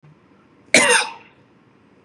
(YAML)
cough_length: 2.0 s
cough_amplitude: 32768
cough_signal_mean_std_ratio: 0.33
survey_phase: beta (2021-08-13 to 2022-03-07)
age: 45-64
gender: Female
wearing_mask: 'No'
symptom_none: true
smoker_status: Ex-smoker
respiratory_condition_asthma: false
respiratory_condition_other: false
recruitment_source: REACT
submission_delay: 1 day
covid_test_result: Negative
covid_test_method: RT-qPCR
influenza_a_test_result: Negative
influenza_b_test_result: Negative